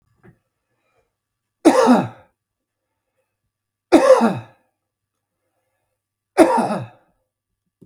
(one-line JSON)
{"three_cough_length": "7.9 s", "three_cough_amplitude": 32768, "three_cough_signal_mean_std_ratio": 0.3, "survey_phase": "beta (2021-08-13 to 2022-03-07)", "age": "45-64", "gender": "Male", "wearing_mask": "No", "symptom_none": true, "smoker_status": "Ex-smoker", "respiratory_condition_asthma": true, "respiratory_condition_other": false, "recruitment_source": "REACT", "submission_delay": "2 days", "covid_test_result": "Negative", "covid_test_method": "RT-qPCR", "influenza_a_test_result": "Negative", "influenza_b_test_result": "Negative"}